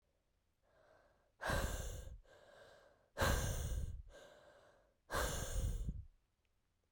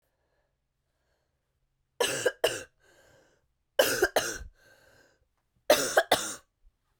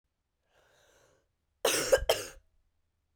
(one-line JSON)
{"exhalation_length": "6.9 s", "exhalation_amplitude": 2323, "exhalation_signal_mean_std_ratio": 0.52, "three_cough_length": "7.0 s", "three_cough_amplitude": 13606, "three_cough_signal_mean_std_ratio": 0.32, "cough_length": "3.2 s", "cough_amplitude": 9554, "cough_signal_mean_std_ratio": 0.29, "survey_phase": "beta (2021-08-13 to 2022-03-07)", "age": "18-44", "gender": "Female", "wearing_mask": "No", "symptom_cough_any": true, "symptom_new_continuous_cough": true, "symptom_runny_or_blocked_nose": true, "symptom_shortness_of_breath": true, "symptom_other": true, "symptom_onset": "4 days", "smoker_status": "Never smoked", "respiratory_condition_asthma": false, "respiratory_condition_other": false, "recruitment_source": "Test and Trace", "submission_delay": "2 days", "covid_test_result": "Positive", "covid_test_method": "RT-qPCR", "covid_ct_value": 24.6, "covid_ct_gene": "N gene", "covid_ct_mean": 24.9, "covid_viral_load": "6900 copies/ml", "covid_viral_load_category": "Minimal viral load (< 10K copies/ml)"}